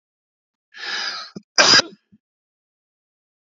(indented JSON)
{
  "cough_length": "3.6 s",
  "cough_amplitude": 32767,
  "cough_signal_mean_std_ratio": 0.27,
  "survey_phase": "beta (2021-08-13 to 2022-03-07)",
  "age": "45-64",
  "gender": "Male",
  "wearing_mask": "No",
  "symptom_cough_any": true,
  "symptom_runny_or_blocked_nose": true,
  "symptom_shortness_of_breath": true,
  "symptom_sore_throat": true,
  "symptom_abdominal_pain": true,
  "symptom_diarrhoea": true,
  "symptom_fatigue": true,
  "symptom_headache": true,
  "symptom_change_to_sense_of_smell_or_taste": true,
  "smoker_status": "Never smoked",
  "respiratory_condition_asthma": false,
  "respiratory_condition_other": false,
  "recruitment_source": "Test and Trace",
  "submission_delay": "2 days",
  "covid_test_result": "Positive",
  "covid_test_method": "RT-qPCR"
}